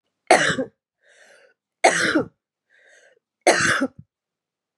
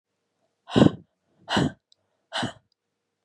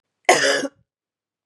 three_cough_length: 4.8 s
three_cough_amplitude: 29957
three_cough_signal_mean_std_ratio: 0.37
exhalation_length: 3.2 s
exhalation_amplitude: 27171
exhalation_signal_mean_std_ratio: 0.27
cough_length: 1.5 s
cough_amplitude: 31429
cough_signal_mean_std_ratio: 0.38
survey_phase: beta (2021-08-13 to 2022-03-07)
age: 45-64
gender: Female
wearing_mask: 'No'
symptom_new_continuous_cough: true
symptom_runny_or_blocked_nose: true
symptom_shortness_of_breath: true
symptom_sore_throat: true
symptom_fatigue: true
symptom_headache: true
symptom_onset: 3 days
smoker_status: Ex-smoker
respiratory_condition_asthma: false
respiratory_condition_other: false
recruitment_source: Test and Trace
submission_delay: 2 days
covid_test_result: Positive
covid_test_method: RT-qPCR
covid_ct_value: 24.6
covid_ct_gene: ORF1ab gene
covid_ct_mean: 25.1
covid_viral_load: 6000 copies/ml
covid_viral_load_category: Minimal viral load (< 10K copies/ml)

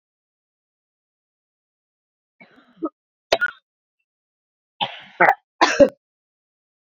cough_length: 6.8 s
cough_amplitude: 29712
cough_signal_mean_std_ratio: 0.21
survey_phase: beta (2021-08-13 to 2022-03-07)
age: 45-64
gender: Female
wearing_mask: 'No'
symptom_headache: true
symptom_onset: 4 days
smoker_status: Never smoked
respiratory_condition_asthma: false
respiratory_condition_other: false
recruitment_source: Test and Trace
submission_delay: 3 days
covid_test_result: Negative
covid_test_method: RT-qPCR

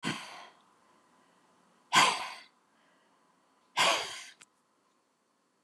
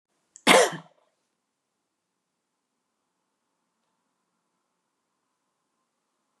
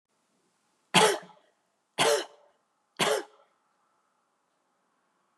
exhalation_length: 5.6 s
exhalation_amplitude: 10453
exhalation_signal_mean_std_ratio: 0.3
cough_length: 6.4 s
cough_amplitude: 23933
cough_signal_mean_std_ratio: 0.15
three_cough_length: 5.4 s
three_cough_amplitude: 15913
three_cough_signal_mean_std_ratio: 0.28
survey_phase: beta (2021-08-13 to 2022-03-07)
age: 65+
gender: Female
wearing_mask: 'No'
symptom_none: true
smoker_status: Ex-smoker
respiratory_condition_asthma: false
respiratory_condition_other: false
recruitment_source: REACT
submission_delay: 2 days
covid_test_result: Negative
covid_test_method: RT-qPCR
influenza_a_test_result: Negative
influenza_b_test_result: Negative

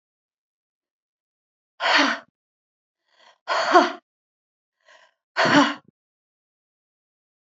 exhalation_length: 7.5 s
exhalation_amplitude: 27775
exhalation_signal_mean_std_ratio: 0.29
survey_phase: beta (2021-08-13 to 2022-03-07)
age: 45-64
gender: Female
wearing_mask: 'No'
symptom_none: true
smoker_status: Never smoked
respiratory_condition_asthma: false
respiratory_condition_other: false
recruitment_source: REACT
submission_delay: 1 day
covid_test_result: Negative
covid_test_method: RT-qPCR
influenza_a_test_result: Negative
influenza_b_test_result: Negative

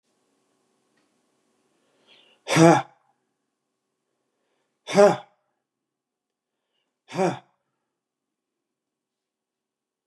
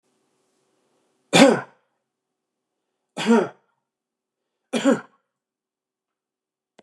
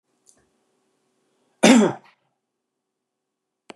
exhalation_length: 10.1 s
exhalation_amplitude: 25220
exhalation_signal_mean_std_ratio: 0.19
three_cough_length: 6.8 s
three_cough_amplitude: 32105
three_cough_signal_mean_std_ratio: 0.24
cough_length: 3.8 s
cough_amplitude: 29658
cough_signal_mean_std_ratio: 0.22
survey_phase: beta (2021-08-13 to 2022-03-07)
age: 65+
gender: Male
wearing_mask: 'No'
symptom_none: true
smoker_status: Never smoked
respiratory_condition_asthma: true
respiratory_condition_other: false
recruitment_source: REACT
submission_delay: 1 day
covid_test_result: Negative
covid_test_method: RT-qPCR
influenza_a_test_result: Negative
influenza_b_test_result: Negative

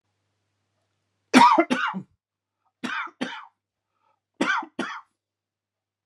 three_cough_length: 6.1 s
three_cough_amplitude: 30366
three_cough_signal_mean_std_ratio: 0.3
survey_phase: beta (2021-08-13 to 2022-03-07)
age: 45-64
gender: Male
wearing_mask: 'No'
symptom_none: true
smoker_status: Never smoked
recruitment_source: REACT
submission_delay: 1 day
covid_test_result: Negative
covid_test_method: RT-qPCR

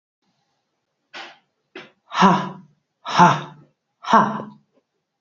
exhalation_length: 5.2 s
exhalation_amplitude: 27744
exhalation_signal_mean_std_ratio: 0.32
survey_phase: beta (2021-08-13 to 2022-03-07)
age: 45-64
gender: Female
wearing_mask: 'No'
symptom_cough_any: true
symptom_runny_or_blocked_nose: true
symptom_onset: 5 days
smoker_status: Never smoked
respiratory_condition_asthma: false
respiratory_condition_other: false
recruitment_source: Test and Trace
submission_delay: 1 day
covid_test_result: Positive
covid_test_method: RT-qPCR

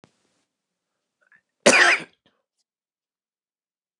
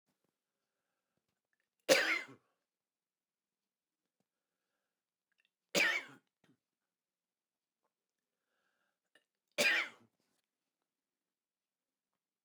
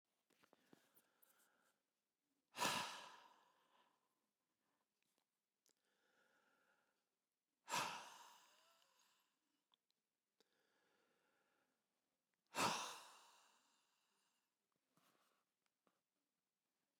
cough_length: 4.0 s
cough_amplitude: 29203
cough_signal_mean_std_ratio: 0.23
three_cough_length: 12.4 s
three_cough_amplitude: 9940
three_cough_signal_mean_std_ratio: 0.21
exhalation_length: 17.0 s
exhalation_amplitude: 1471
exhalation_signal_mean_std_ratio: 0.23
survey_phase: beta (2021-08-13 to 2022-03-07)
age: 65+
gender: Male
wearing_mask: 'No'
symptom_sore_throat: true
smoker_status: Never smoked
respiratory_condition_asthma: false
respiratory_condition_other: false
recruitment_source: REACT
submission_delay: 2 days
covid_test_result: Negative
covid_test_method: RT-qPCR
influenza_a_test_result: Negative
influenza_b_test_result: Negative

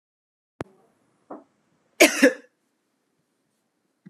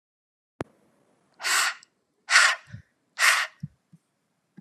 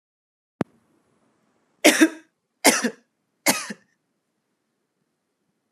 cough_length: 4.1 s
cough_amplitude: 32506
cough_signal_mean_std_ratio: 0.19
exhalation_length: 4.6 s
exhalation_amplitude: 24702
exhalation_signal_mean_std_ratio: 0.34
three_cough_length: 5.7 s
three_cough_amplitude: 32676
three_cough_signal_mean_std_ratio: 0.24
survey_phase: beta (2021-08-13 to 2022-03-07)
age: 18-44
gender: Female
wearing_mask: 'No'
symptom_none: true
symptom_onset: 2 days
smoker_status: Never smoked
respiratory_condition_asthma: false
respiratory_condition_other: false
recruitment_source: REACT
submission_delay: 0 days
covid_test_result: Negative
covid_test_method: RT-qPCR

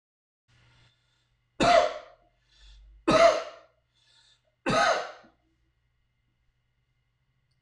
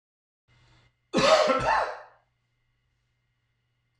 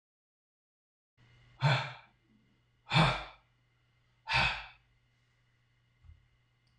three_cough_length: 7.6 s
three_cough_amplitude: 13981
three_cough_signal_mean_std_ratio: 0.3
cough_length: 4.0 s
cough_amplitude: 12858
cough_signal_mean_std_ratio: 0.36
exhalation_length: 6.8 s
exhalation_amplitude: 7884
exhalation_signal_mean_std_ratio: 0.29
survey_phase: beta (2021-08-13 to 2022-03-07)
age: 65+
gender: Male
wearing_mask: 'No'
symptom_cough_any: true
symptom_runny_or_blocked_nose: true
symptom_onset: 12 days
smoker_status: Never smoked
respiratory_condition_asthma: false
respiratory_condition_other: false
recruitment_source: REACT
submission_delay: 3 days
covid_test_result: Negative
covid_test_method: RT-qPCR
influenza_a_test_result: Negative
influenza_b_test_result: Negative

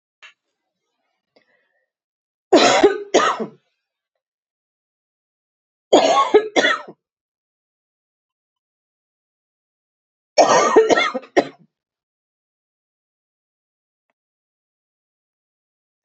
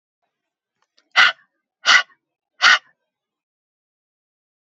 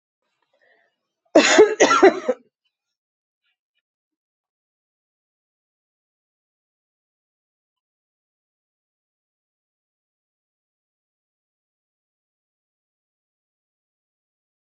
three_cough_length: 16.0 s
three_cough_amplitude: 30329
three_cough_signal_mean_std_ratio: 0.29
exhalation_length: 4.8 s
exhalation_amplitude: 32264
exhalation_signal_mean_std_ratio: 0.24
cough_length: 14.8 s
cough_amplitude: 32451
cough_signal_mean_std_ratio: 0.17
survey_phase: beta (2021-08-13 to 2022-03-07)
age: 45-64
gender: Female
wearing_mask: 'No'
symptom_none: true
smoker_status: Never smoked
respiratory_condition_asthma: false
respiratory_condition_other: false
recruitment_source: REACT
submission_delay: 1 day
covid_test_result: Negative
covid_test_method: RT-qPCR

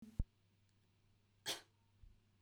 cough_length: 2.4 s
cough_amplitude: 2016
cough_signal_mean_std_ratio: 0.24
survey_phase: beta (2021-08-13 to 2022-03-07)
age: 18-44
gender: Female
wearing_mask: 'No'
symptom_none: true
smoker_status: Never smoked
respiratory_condition_asthma: false
respiratory_condition_other: false
recruitment_source: REACT
submission_delay: 1 day
covid_test_result: Negative
covid_test_method: RT-qPCR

